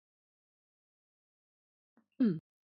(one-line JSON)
{"cough_length": "2.6 s", "cough_amplitude": 2869, "cough_signal_mean_std_ratio": 0.21, "survey_phase": "beta (2021-08-13 to 2022-03-07)", "age": "45-64", "gender": "Female", "wearing_mask": "No", "symptom_none": true, "smoker_status": "Never smoked", "respiratory_condition_asthma": false, "respiratory_condition_other": false, "recruitment_source": "REACT", "submission_delay": "1 day", "covid_test_result": "Negative", "covid_test_method": "RT-qPCR", "influenza_a_test_result": "Negative", "influenza_b_test_result": "Negative"}